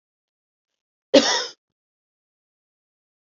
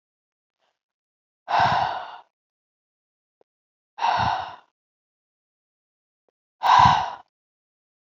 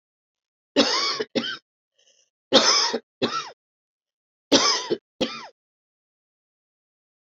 {"cough_length": "3.2 s", "cough_amplitude": 29034, "cough_signal_mean_std_ratio": 0.21, "exhalation_length": "8.0 s", "exhalation_amplitude": 24129, "exhalation_signal_mean_std_ratio": 0.32, "three_cough_length": "7.3 s", "three_cough_amplitude": 28699, "three_cough_signal_mean_std_ratio": 0.37, "survey_phase": "beta (2021-08-13 to 2022-03-07)", "age": "45-64", "gender": "Female", "wearing_mask": "No", "symptom_cough_any": true, "symptom_runny_or_blocked_nose": true, "symptom_sore_throat": true, "symptom_fatigue": true, "symptom_headache": true, "smoker_status": "Never smoked", "respiratory_condition_asthma": false, "respiratory_condition_other": false, "recruitment_source": "Test and Trace", "submission_delay": "2 days", "covid_test_result": "Positive", "covid_test_method": "LFT"}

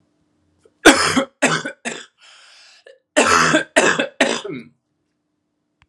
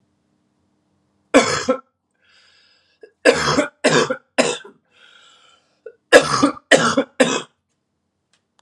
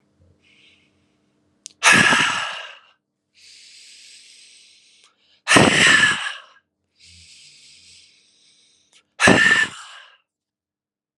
{"cough_length": "5.9 s", "cough_amplitude": 32768, "cough_signal_mean_std_ratio": 0.41, "three_cough_length": "8.6 s", "three_cough_amplitude": 32768, "three_cough_signal_mean_std_ratio": 0.36, "exhalation_length": "11.2 s", "exhalation_amplitude": 32700, "exhalation_signal_mean_std_ratio": 0.34, "survey_phase": "alpha (2021-03-01 to 2021-08-12)", "age": "18-44", "gender": "Male", "wearing_mask": "No", "symptom_none": true, "smoker_status": "Ex-smoker", "respiratory_condition_asthma": false, "respiratory_condition_other": false, "recruitment_source": "REACT", "submission_delay": "0 days", "covid_test_result": "Negative", "covid_test_method": "RT-qPCR"}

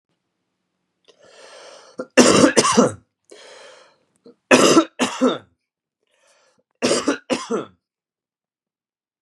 {"three_cough_length": "9.2 s", "three_cough_amplitude": 32768, "three_cough_signal_mean_std_ratio": 0.34, "survey_phase": "beta (2021-08-13 to 2022-03-07)", "age": "45-64", "gender": "Male", "wearing_mask": "No", "symptom_fatigue": true, "symptom_change_to_sense_of_smell_or_taste": true, "symptom_onset": "8 days", "smoker_status": "Ex-smoker", "respiratory_condition_asthma": false, "respiratory_condition_other": false, "recruitment_source": "Test and Trace", "submission_delay": "2 days", "covid_test_result": "Positive", "covid_test_method": "ePCR"}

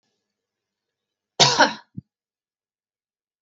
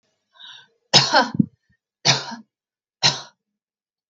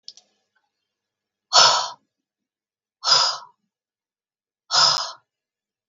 {"cough_length": "3.4 s", "cough_amplitude": 32766, "cough_signal_mean_std_ratio": 0.22, "three_cough_length": "4.1 s", "three_cough_amplitude": 32768, "three_cough_signal_mean_std_ratio": 0.31, "exhalation_length": "5.9 s", "exhalation_amplitude": 32768, "exhalation_signal_mean_std_ratio": 0.31, "survey_phase": "beta (2021-08-13 to 2022-03-07)", "age": "45-64", "gender": "Female", "wearing_mask": "No", "symptom_none": true, "smoker_status": "Ex-smoker", "respiratory_condition_asthma": false, "respiratory_condition_other": false, "recruitment_source": "REACT", "submission_delay": "0 days", "covid_test_result": "Negative", "covid_test_method": "RT-qPCR", "influenza_a_test_result": "Negative", "influenza_b_test_result": "Negative"}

